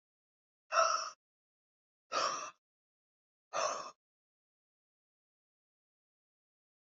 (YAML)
exhalation_length: 7.0 s
exhalation_amplitude: 5040
exhalation_signal_mean_std_ratio: 0.28
survey_phase: beta (2021-08-13 to 2022-03-07)
age: 18-44
gender: Female
wearing_mask: 'No'
symptom_new_continuous_cough: true
symptom_runny_or_blocked_nose: true
symptom_shortness_of_breath: true
symptom_sore_throat: true
symptom_fatigue: true
symptom_fever_high_temperature: true
symptom_headache: true
symptom_change_to_sense_of_smell_or_taste: true
symptom_onset: 5 days
smoker_status: Prefer not to say
respiratory_condition_asthma: true
respiratory_condition_other: false
recruitment_source: Test and Trace
submission_delay: 2 days
covid_test_result: Positive
covid_test_method: RT-qPCR
covid_ct_value: 14.7
covid_ct_gene: ORF1ab gene
covid_ct_mean: 15.0
covid_viral_load: 12000000 copies/ml
covid_viral_load_category: High viral load (>1M copies/ml)